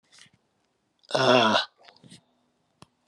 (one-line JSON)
{"exhalation_length": "3.1 s", "exhalation_amplitude": 18044, "exhalation_signal_mean_std_ratio": 0.33, "survey_phase": "alpha (2021-03-01 to 2021-08-12)", "age": "45-64", "gender": "Female", "wearing_mask": "No", "symptom_cough_any": true, "symptom_shortness_of_breath": true, "symptom_headache": true, "symptom_onset": "3 days", "smoker_status": "Ex-smoker", "respiratory_condition_asthma": false, "respiratory_condition_other": false, "recruitment_source": "Test and Trace", "submission_delay": "2 days", "covid_test_result": "Positive", "covid_test_method": "RT-qPCR", "covid_ct_value": 17.3, "covid_ct_gene": "ORF1ab gene", "covid_ct_mean": 17.6, "covid_viral_load": "1700000 copies/ml", "covid_viral_load_category": "High viral load (>1M copies/ml)"}